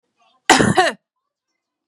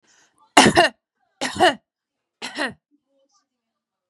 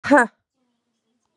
{"cough_length": "1.9 s", "cough_amplitude": 32768, "cough_signal_mean_std_ratio": 0.35, "three_cough_length": "4.1 s", "three_cough_amplitude": 32768, "three_cough_signal_mean_std_ratio": 0.29, "exhalation_length": "1.4 s", "exhalation_amplitude": 28604, "exhalation_signal_mean_std_ratio": 0.27, "survey_phase": "beta (2021-08-13 to 2022-03-07)", "age": "18-44", "gender": "Female", "wearing_mask": "No", "symptom_none": true, "smoker_status": "Current smoker (1 to 10 cigarettes per day)", "respiratory_condition_asthma": false, "respiratory_condition_other": false, "recruitment_source": "REACT", "submission_delay": "1 day", "covid_test_result": "Negative", "covid_test_method": "RT-qPCR", "influenza_a_test_result": "Unknown/Void", "influenza_b_test_result": "Unknown/Void"}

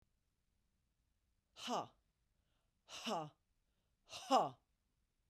{"exhalation_length": "5.3 s", "exhalation_amplitude": 3355, "exhalation_signal_mean_std_ratio": 0.27, "survey_phase": "beta (2021-08-13 to 2022-03-07)", "age": "45-64", "gender": "Female", "wearing_mask": "No", "symptom_none": true, "symptom_onset": "4 days", "smoker_status": "Ex-smoker", "respiratory_condition_asthma": false, "respiratory_condition_other": false, "recruitment_source": "REACT", "submission_delay": "2 days", "covid_test_result": "Negative", "covid_test_method": "RT-qPCR", "influenza_a_test_result": "Negative", "influenza_b_test_result": "Negative"}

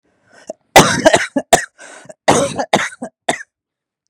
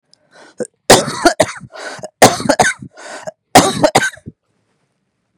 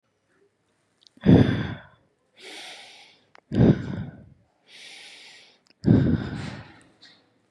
{"cough_length": "4.1 s", "cough_amplitude": 32768, "cough_signal_mean_std_ratio": 0.39, "three_cough_length": "5.4 s", "three_cough_amplitude": 32768, "three_cough_signal_mean_std_ratio": 0.38, "exhalation_length": "7.5 s", "exhalation_amplitude": 22992, "exhalation_signal_mean_std_ratio": 0.33, "survey_phase": "beta (2021-08-13 to 2022-03-07)", "age": "18-44", "gender": "Male", "wearing_mask": "Yes", "symptom_none": true, "smoker_status": "Never smoked", "respiratory_condition_asthma": false, "respiratory_condition_other": false, "recruitment_source": "REACT", "submission_delay": "3 days", "covid_test_result": "Negative", "covid_test_method": "RT-qPCR", "influenza_a_test_result": "Negative", "influenza_b_test_result": "Negative"}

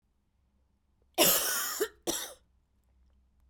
{"cough_length": "3.5 s", "cough_amplitude": 12084, "cough_signal_mean_std_ratio": 0.38, "survey_phase": "beta (2021-08-13 to 2022-03-07)", "age": "18-44", "gender": "Female", "wearing_mask": "No", "symptom_runny_or_blocked_nose": true, "symptom_sore_throat": true, "symptom_diarrhoea": true, "symptom_fatigue": true, "symptom_other": true, "symptom_onset": "5 days", "smoker_status": "Never smoked", "respiratory_condition_asthma": true, "respiratory_condition_other": false, "recruitment_source": "Test and Trace", "submission_delay": "1 day", "covid_test_result": "Positive", "covid_test_method": "RT-qPCR", "covid_ct_value": 20.8, "covid_ct_gene": "N gene"}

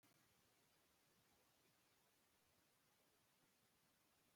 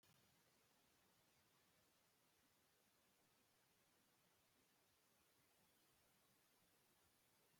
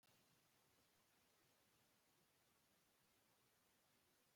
{"cough_length": "4.4 s", "cough_amplitude": 20, "cough_signal_mean_std_ratio": 1.06, "exhalation_length": "7.6 s", "exhalation_amplitude": 29, "exhalation_signal_mean_std_ratio": 1.08, "three_cough_length": "4.4 s", "three_cough_amplitude": 20, "three_cough_signal_mean_std_ratio": 1.07, "survey_phase": "beta (2021-08-13 to 2022-03-07)", "age": "45-64", "gender": "Male", "wearing_mask": "No", "symptom_none": true, "smoker_status": "Ex-smoker", "respiratory_condition_asthma": false, "respiratory_condition_other": false, "recruitment_source": "REACT", "submission_delay": "1 day", "covid_test_result": "Negative", "covid_test_method": "RT-qPCR"}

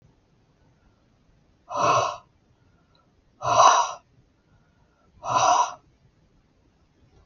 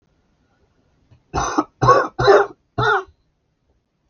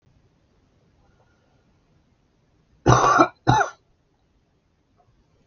{"exhalation_length": "7.3 s", "exhalation_amplitude": 22872, "exhalation_signal_mean_std_ratio": 0.34, "three_cough_length": "4.1 s", "three_cough_amplitude": 32684, "three_cough_signal_mean_std_ratio": 0.38, "cough_length": "5.5 s", "cough_amplitude": 32001, "cough_signal_mean_std_ratio": 0.27, "survey_phase": "beta (2021-08-13 to 2022-03-07)", "age": "45-64", "gender": "Male", "wearing_mask": "No", "symptom_cough_any": true, "symptom_runny_or_blocked_nose": true, "symptom_fatigue": true, "symptom_onset": "4 days", "smoker_status": "Ex-smoker", "respiratory_condition_asthma": false, "respiratory_condition_other": false, "recruitment_source": "Test and Trace", "submission_delay": "1 day", "covid_test_result": "Positive", "covid_test_method": "RT-qPCR", "covid_ct_value": 21.3, "covid_ct_gene": "N gene"}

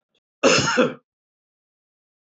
{"cough_length": "2.2 s", "cough_amplitude": 19840, "cough_signal_mean_std_ratio": 0.37, "survey_phase": "beta (2021-08-13 to 2022-03-07)", "age": "65+", "gender": "Male", "wearing_mask": "No", "symptom_runny_or_blocked_nose": true, "symptom_onset": "7 days", "smoker_status": "Ex-smoker", "respiratory_condition_asthma": false, "respiratory_condition_other": false, "recruitment_source": "Test and Trace", "submission_delay": "2 days", "covid_test_result": "Positive", "covid_test_method": "RT-qPCR", "covid_ct_value": 25.3, "covid_ct_gene": "ORF1ab gene"}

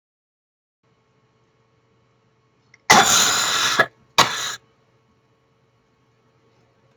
{"cough_length": "7.0 s", "cough_amplitude": 32768, "cough_signal_mean_std_ratio": 0.31, "survey_phase": "beta (2021-08-13 to 2022-03-07)", "age": "65+", "gender": "Female", "wearing_mask": "No", "symptom_none": true, "smoker_status": "Ex-smoker", "respiratory_condition_asthma": false, "respiratory_condition_other": true, "recruitment_source": "REACT", "submission_delay": "1 day", "covid_test_result": "Negative", "covid_test_method": "RT-qPCR", "influenza_a_test_result": "Negative", "influenza_b_test_result": "Negative"}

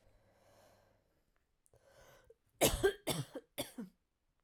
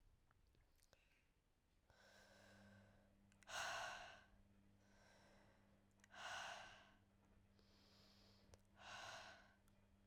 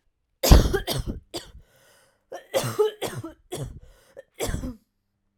{"three_cough_length": "4.4 s", "three_cough_amplitude": 5175, "three_cough_signal_mean_std_ratio": 0.28, "exhalation_length": "10.1 s", "exhalation_amplitude": 478, "exhalation_signal_mean_std_ratio": 0.5, "cough_length": "5.4 s", "cough_amplitude": 32768, "cough_signal_mean_std_ratio": 0.34, "survey_phase": "alpha (2021-03-01 to 2021-08-12)", "age": "18-44", "gender": "Female", "wearing_mask": "No", "symptom_new_continuous_cough": true, "symptom_headache": true, "symptom_change_to_sense_of_smell_or_taste": true, "smoker_status": "Never smoked", "respiratory_condition_asthma": false, "respiratory_condition_other": false, "recruitment_source": "Test and Trace", "submission_delay": "2 days", "covid_test_result": "Positive", "covid_test_method": "LFT"}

